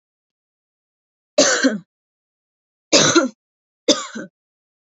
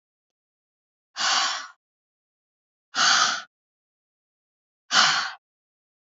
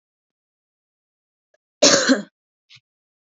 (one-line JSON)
{"three_cough_length": "4.9 s", "three_cough_amplitude": 30400, "three_cough_signal_mean_std_ratio": 0.33, "exhalation_length": "6.1 s", "exhalation_amplitude": 23346, "exhalation_signal_mean_std_ratio": 0.35, "cough_length": "3.2 s", "cough_amplitude": 29992, "cough_signal_mean_std_ratio": 0.25, "survey_phase": "beta (2021-08-13 to 2022-03-07)", "age": "18-44", "gender": "Female", "wearing_mask": "No", "symptom_none": true, "smoker_status": "Never smoked", "respiratory_condition_asthma": false, "respiratory_condition_other": false, "recruitment_source": "REACT", "submission_delay": "2 days", "covid_test_result": "Negative", "covid_test_method": "RT-qPCR", "influenza_a_test_result": "Negative", "influenza_b_test_result": "Negative"}